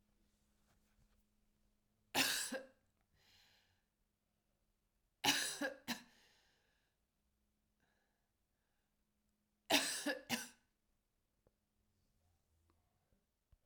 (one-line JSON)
{"three_cough_length": "13.7 s", "three_cough_amplitude": 3983, "three_cough_signal_mean_std_ratio": 0.26, "survey_phase": "beta (2021-08-13 to 2022-03-07)", "age": "18-44", "gender": "Female", "wearing_mask": "No", "symptom_cough_any": true, "symptom_new_continuous_cough": true, "symptom_runny_or_blocked_nose": true, "symptom_shortness_of_breath": true, "symptom_sore_throat": true, "symptom_fatigue": true, "symptom_headache": true, "symptom_onset": "3 days", "smoker_status": "Never smoked", "respiratory_condition_asthma": false, "respiratory_condition_other": false, "recruitment_source": "Test and Trace", "submission_delay": "1 day", "covid_test_result": "Positive", "covid_test_method": "RT-qPCR"}